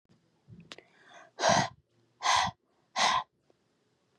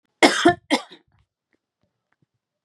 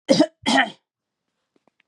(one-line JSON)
{"exhalation_length": "4.2 s", "exhalation_amplitude": 8946, "exhalation_signal_mean_std_ratio": 0.37, "cough_length": "2.6 s", "cough_amplitude": 32585, "cough_signal_mean_std_ratio": 0.27, "three_cough_length": "1.9 s", "three_cough_amplitude": 27580, "three_cough_signal_mean_std_ratio": 0.35, "survey_phase": "beta (2021-08-13 to 2022-03-07)", "age": "18-44", "gender": "Female", "wearing_mask": "No", "symptom_none": true, "smoker_status": "Ex-smoker", "respiratory_condition_asthma": false, "respiratory_condition_other": false, "recruitment_source": "REACT", "submission_delay": "3 days", "covid_test_result": "Negative", "covid_test_method": "RT-qPCR", "influenza_a_test_result": "Negative", "influenza_b_test_result": "Negative"}